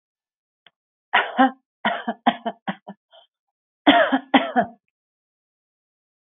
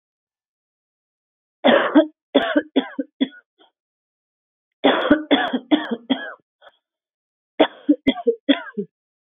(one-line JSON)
{"cough_length": "6.2 s", "cough_amplitude": 27358, "cough_signal_mean_std_ratio": 0.32, "three_cough_length": "9.3 s", "three_cough_amplitude": 27428, "three_cough_signal_mean_std_ratio": 0.36, "survey_phase": "beta (2021-08-13 to 2022-03-07)", "age": "18-44", "gender": "Female", "wearing_mask": "No", "symptom_none": true, "symptom_onset": "13 days", "smoker_status": "Ex-smoker", "respiratory_condition_asthma": false, "respiratory_condition_other": false, "recruitment_source": "REACT", "submission_delay": "1 day", "covid_test_result": "Negative", "covid_test_method": "RT-qPCR", "influenza_a_test_result": "Unknown/Void", "influenza_b_test_result": "Unknown/Void"}